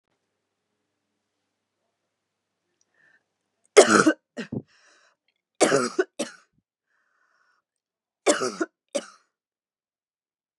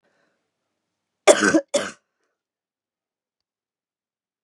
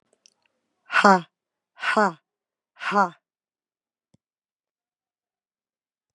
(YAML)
three_cough_length: 10.6 s
three_cough_amplitude: 32312
three_cough_signal_mean_std_ratio: 0.22
cough_length: 4.4 s
cough_amplitude: 32755
cough_signal_mean_std_ratio: 0.21
exhalation_length: 6.1 s
exhalation_amplitude: 26442
exhalation_signal_mean_std_ratio: 0.24
survey_phase: beta (2021-08-13 to 2022-03-07)
age: 45-64
gender: Female
wearing_mask: 'No'
symptom_cough_any: true
symptom_other: true
symptom_onset: 8 days
smoker_status: Never smoked
respiratory_condition_asthma: false
respiratory_condition_other: false
recruitment_source: Test and Trace
submission_delay: 1 day
covid_test_result: Negative
covid_test_method: RT-qPCR